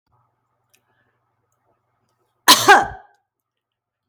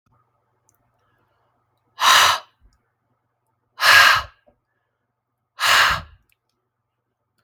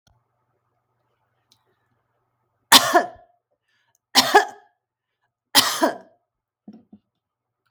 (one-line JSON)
{"cough_length": "4.1 s", "cough_amplitude": 32768, "cough_signal_mean_std_ratio": 0.22, "exhalation_length": "7.4 s", "exhalation_amplitude": 32767, "exhalation_signal_mean_std_ratio": 0.31, "three_cough_length": "7.7 s", "three_cough_amplitude": 32768, "three_cough_signal_mean_std_ratio": 0.24, "survey_phase": "beta (2021-08-13 to 2022-03-07)", "age": "45-64", "gender": "Female", "wearing_mask": "No", "symptom_none": true, "smoker_status": "Ex-smoker", "respiratory_condition_asthma": false, "respiratory_condition_other": false, "recruitment_source": "REACT", "submission_delay": "2 days", "covid_test_result": "Negative", "covid_test_method": "RT-qPCR", "influenza_a_test_result": "Negative", "influenza_b_test_result": "Negative"}